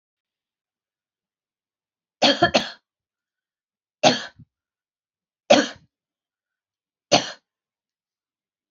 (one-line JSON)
{"three_cough_length": "8.7 s", "three_cough_amplitude": 27271, "three_cough_signal_mean_std_ratio": 0.22, "survey_phase": "beta (2021-08-13 to 2022-03-07)", "age": "45-64", "gender": "Female", "wearing_mask": "No", "symptom_none": true, "smoker_status": "Current smoker (e-cigarettes or vapes only)", "respiratory_condition_asthma": false, "respiratory_condition_other": false, "recruitment_source": "REACT", "submission_delay": "2 days", "covid_test_result": "Negative", "covid_test_method": "RT-qPCR"}